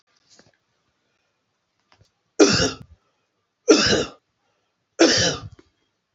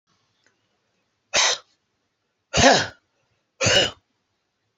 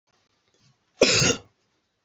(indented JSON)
{
  "three_cough_length": "6.1 s",
  "three_cough_amplitude": 28313,
  "three_cough_signal_mean_std_ratio": 0.32,
  "exhalation_length": "4.8 s",
  "exhalation_amplitude": 28525,
  "exhalation_signal_mean_std_ratio": 0.33,
  "cough_length": "2.0 s",
  "cough_amplitude": 19901,
  "cough_signal_mean_std_ratio": 0.33,
  "survey_phase": "alpha (2021-03-01 to 2021-08-12)",
  "age": "45-64",
  "gender": "Male",
  "wearing_mask": "No",
  "symptom_none": true,
  "smoker_status": "Ex-smoker",
  "respiratory_condition_asthma": true,
  "respiratory_condition_other": true,
  "recruitment_source": "REACT",
  "submission_delay": "2 days",
  "covid_test_result": "Negative",
  "covid_test_method": "RT-qPCR"
}